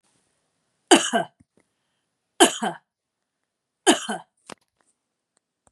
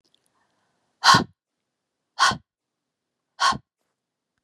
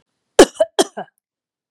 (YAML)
three_cough_length: 5.7 s
three_cough_amplitude: 32099
three_cough_signal_mean_std_ratio: 0.24
exhalation_length: 4.4 s
exhalation_amplitude: 27327
exhalation_signal_mean_std_ratio: 0.25
cough_length: 1.7 s
cough_amplitude: 32768
cough_signal_mean_std_ratio: 0.24
survey_phase: beta (2021-08-13 to 2022-03-07)
age: 45-64
gender: Female
wearing_mask: 'No'
symptom_none: true
smoker_status: Never smoked
respiratory_condition_asthma: false
respiratory_condition_other: false
recruitment_source: REACT
submission_delay: 2 days
covid_test_result: Negative
covid_test_method: RT-qPCR
influenza_a_test_result: Negative
influenza_b_test_result: Negative